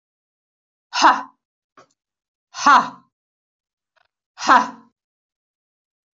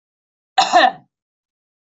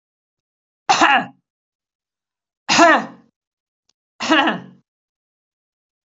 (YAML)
exhalation_length: 6.1 s
exhalation_amplitude: 24457
exhalation_signal_mean_std_ratio: 0.25
cough_length: 2.0 s
cough_amplitude: 25928
cough_signal_mean_std_ratio: 0.31
three_cough_length: 6.1 s
three_cough_amplitude: 26150
three_cough_signal_mean_std_ratio: 0.32
survey_phase: beta (2021-08-13 to 2022-03-07)
age: 45-64
gender: Female
wearing_mask: 'No'
symptom_none: true
smoker_status: Never smoked
respiratory_condition_asthma: false
respiratory_condition_other: false
recruitment_source: REACT
submission_delay: 2 days
covid_test_result: Negative
covid_test_method: RT-qPCR